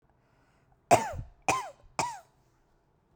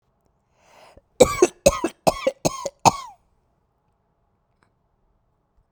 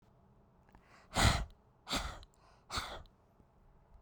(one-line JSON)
{"three_cough_length": "3.2 s", "three_cough_amplitude": 16013, "three_cough_signal_mean_std_ratio": 0.29, "cough_length": "5.7 s", "cough_amplitude": 32768, "cough_signal_mean_std_ratio": 0.24, "exhalation_length": "4.0 s", "exhalation_amplitude": 5474, "exhalation_signal_mean_std_ratio": 0.34, "survey_phase": "beta (2021-08-13 to 2022-03-07)", "age": "45-64", "gender": "Female", "wearing_mask": "No", "symptom_other": true, "symptom_onset": "8 days", "smoker_status": "Never smoked", "respiratory_condition_asthma": true, "respiratory_condition_other": false, "recruitment_source": "REACT", "submission_delay": "1 day", "covid_test_result": "Negative", "covid_test_method": "RT-qPCR"}